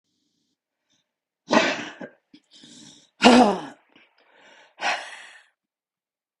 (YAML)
exhalation_length: 6.4 s
exhalation_amplitude: 32768
exhalation_signal_mean_std_ratio: 0.27
survey_phase: beta (2021-08-13 to 2022-03-07)
age: 45-64
gender: Female
wearing_mask: 'No'
symptom_cough_any: true
symptom_runny_or_blocked_nose: true
symptom_sore_throat: true
symptom_fatigue: true
smoker_status: Ex-smoker
respiratory_condition_asthma: false
respiratory_condition_other: false
recruitment_source: Test and Trace
submission_delay: 7 days
covid_test_result: Negative
covid_test_method: RT-qPCR